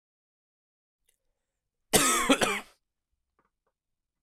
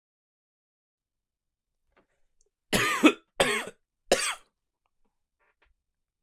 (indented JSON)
{
  "cough_length": "4.2 s",
  "cough_amplitude": 15445,
  "cough_signal_mean_std_ratio": 0.29,
  "three_cough_length": "6.2 s",
  "three_cough_amplitude": 18641,
  "three_cough_signal_mean_std_ratio": 0.26,
  "survey_phase": "beta (2021-08-13 to 2022-03-07)",
  "age": "18-44",
  "gender": "Male",
  "wearing_mask": "No",
  "symptom_cough_any": true,
  "symptom_new_continuous_cough": true,
  "symptom_runny_or_blocked_nose": true,
  "symptom_shortness_of_breath": true,
  "symptom_sore_throat": true,
  "symptom_diarrhoea": true,
  "symptom_fatigue": true,
  "symptom_change_to_sense_of_smell_or_taste": true,
  "symptom_onset": "4 days",
  "smoker_status": "Current smoker (1 to 10 cigarettes per day)",
  "respiratory_condition_asthma": false,
  "respiratory_condition_other": false,
  "recruitment_source": "Test and Trace",
  "submission_delay": "1 day",
  "covid_test_result": "Positive",
  "covid_test_method": "RT-qPCR",
  "covid_ct_value": 31.6,
  "covid_ct_gene": "N gene"
}